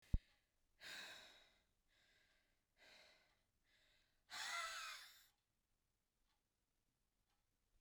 {"exhalation_length": "7.8 s", "exhalation_amplitude": 1965, "exhalation_signal_mean_std_ratio": 0.26, "survey_phase": "beta (2021-08-13 to 2022-03-07)", "age": "45-64", "gender": "Female", "wearing_mask": "No", "symptom_cough_any": true, "symptom_runny_or_blocked_nose": true, "symptom_fatigue": true, "symptom_headache": true, "symptom_onset": "3 days", "smoker_status": "Never smoked", "respiratory_condition_asthma": false, "respiratory_condition_other": false, "recruitment_source": "Test and Trace", "submission_delay": "1 day", "covid_test_result": "Positive", "covid_test_method": "ePCR"}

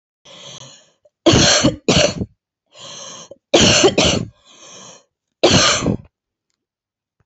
{"three_cough_length": "7.3 s", "three_cough_amplitude": 30750, "three_cough_signal_mean_std_ratio": 0.45, "survey_phase": "beta (2021-08-13 to 2022-03-07)", "age": "18-44", "gender": "Female", "wearing_mask": "No", "symptom_cough_any": true, "symptom_sore_throat": true, "symptom_fatigue": true, "symptom_fever_high_temperature": true, "symptom_headache": true, "symptom_other": true, "symptom_onset": "3 days", "smoker_status": "Current smoker (e-cigarettes or vapes only)", "respiratory_condition_asthma": true, "respiratory_condition_other": false, "recruitment_source": "Test and Trace", "submission_delay": "2 days", "covid_test_result": "Positive", "covid_test_method": "RT-qPCR", "covid_ct_value": 17.7, "covid_ct_gene": "ORF1ab gene", "covid_ct_mean": 17.9, "covid_viral_load": "1300000 copies/ml", "covid_viral_load_category": "High viral load (>1M copies/ml)"}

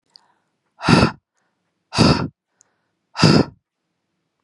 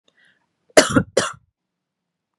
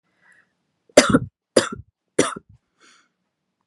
{"exhalation_length": "4.4 s", "exhalation_amplitude": 32756, "exhalation_signal_mean_std_ratio": 0.33, "cough_length": "2.4 s", "cough_amplitude": 32768, "cough_signal_mean_std_ratio": 0.25, "three_cough_length": "3.7 s", "three_cough_amplitude": 32768, "three_cough_signal_mean_std_ratio": 0.24, "survey_phase": "beta (2021-08-13 to 2022-03-07)", "age": "18-44", "gender": "Female", "wearing_mask": "No", "symptom_cough_any": true, "symptom_sore_throat": true, "symptom_fatigue": true, "symptom_headache": true, "smoker_status": "Never smoked", "respiratory_condition_asthma": false, "respiratory_condition_other": false, "recruitment_source": "Test and Trace", "submission_delay": "0 days", "covid_test_result": "Positive", "covid_test_method": "LFT"}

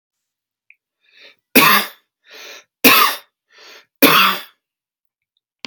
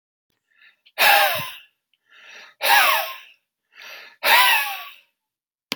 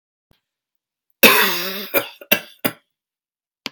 {"three_cough_length": "5.7 s", "three_cough_amplitude": 32768, "three_cough_signal_mean_std_ratio": 0.34, "exhalation_length": "5.8 s", "exhalation_amplitude": 28227, "exhalation_signal_mean_std_ratio": 0.42, "cough_length": "3.7 s", "cough_amplitude": 32768, "cough_signal_mean_std_ratio": 0.32, "survey_phase": "beta (2021-08-13 to 2022-03-07)", "age": "18-44", "gender": "Male", "wearing_mask": "No", "symptom_fatigue": true, "smoker_status": "Never smoked", "respiratory_condition_asthma": false, "respiratory_condition_other": false, "recruitment_source": "REACT", "submission_delay": "31 days", "covid_test_result": "Negative", "covid_test_method": "RT-qPCR"}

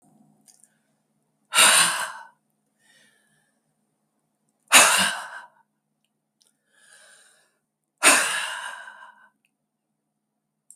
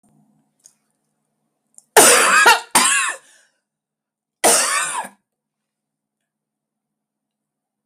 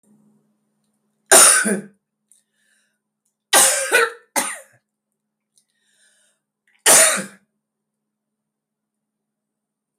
{"exhalation_length": "10.8 s", "exhalation_amplitude": 32768, "exhalation_signal_mean_std_ratio": 0.28, "cough_length": "7.9 s", "cough_amplitude": 32768, "cough_signal_mean_std_ratio": 0.35, "three_cough_length": "10.0 s", "three_cough_amplitude": 32768, "three_cough_signal_mean_std_ratio": 0.3, "survey_phase": "beta (2021-08-13 to 2022-03-07)", "age": "65+", "gender": "Female", "wearing_mask": "No", "symptom_runny_or_blocked_nose": true, "smoker_status": "Ex-smoker", "respiratory_condition_asthma": false, "respiratory_condition_other": false, "recruitment_source": "REACT", "submission_delay": "2 days", "covid_test_result": "Negative", "covid_test_method": "RT-qPCR", "influenza_a_test_result": "Negative", "influenza_b_test_result": "Negative"}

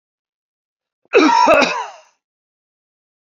{"cough_length": "3.3 s", "cough_amplitude": 28104, "cough_signal_mean_std_ratio": 0.38, "survey_phase": "beta (2021-08-13 to 2022-03-07)", "age": "45-64", "gender": "Male", "wearing_mask": "No", "symptom_sore_throat": true, "symptom_fatigue": true, "symptom_headache": true, "symptom_onset": "13 days", "smoker_status": "Never smoked", "respiratory_condition_asthma": false, "respiratory_condition_other": false, "recruitment_source": "REACT", "submission_delay": "1 day", "covid_test_result": "Negative", "covid_test_method": "RT-qPCR", "influenza_a_test_result": "Unknown/Void", "influenza_b_test_result": "Unknown/Void"}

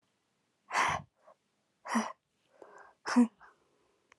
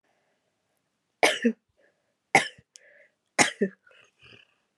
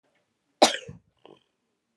{"exhalation_length": "4.2 s", "exhalation_amplitude": 6367, "exhalation_signal_mean_std_ratio": 0.31, "three_cough_length": "4.8 s", "three_cough_amplitude": 21820, "three_cough_signal_mean_std_ratio": 0.24, "cough_length": "2.0 s", "cough_amplitude": 23231, "cough_signal_mean_std_ratio": 0.19, "survey_phase": "alpha (2021-03-01 to 2021-08-12)", "age": "18-44", "gender": "Female", "wearing_mask": "No", "symptom_shortness_of_breath": true, "symptom_abdominal_pain": true, "symptom_diarrhoea": true, "symptom_fatigue": true, "symptom_fever_high_temperature": true, "symptom_headache": true, "symptom_onset": "4 days", "smoker_status": "Current smoker (1 to 10 cigarettes per day)", "respiratory_condition_asthma": true, "respiratory_condition_other": false, "recruitment_source": "Test and Trace", "submission_delay": "1 day", "covid_test_result": "Positive", "covid_test_method": "RT-qPCR", "covid_ct_value": 16.7, "covid_ct_gene": "ORF1ab gene", "covid_ct_mean": 18.1, "covid_viral_load": "1200000 copies/ml", "covid_viral_load_category": "High viral load (>1M copies/ml)"}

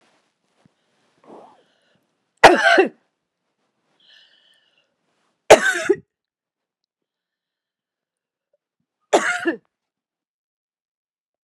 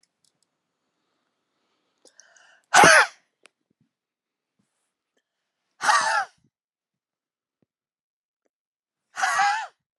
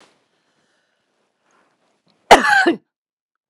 {"three_cough_length": "11.4 s", "three_cough_amplitude": 32768, "three_cough_signal_mean_std_ratio": 0.21, "exhalation_length": "10.0 s", "exhalation_amplitude": 29921, "exhalation_signal_mean_std_ratio": 0.25, "cough_length": "3.5 s", "cough_amplitude": 32768, "cough_signal_mean_std_ratio": 0.25, "survey_phase": "beta (2021-08-13 to 2022-03-07)", "age": "45-64", "gender": "Female", "wearing_mask": "No", "symptom_none": true, "smoker_status": "Never smoked", "respiratory_condition_asthma": false, "respiratory_condition_other": false, "recruitment_source": "REACT", "submission_delay": "3 days", "covid_test_result": "Negative", "covid_test_method": "RT-qPCR", "influenza_a_test_result": "Negative", "influenza_b_test_result": "Negative"}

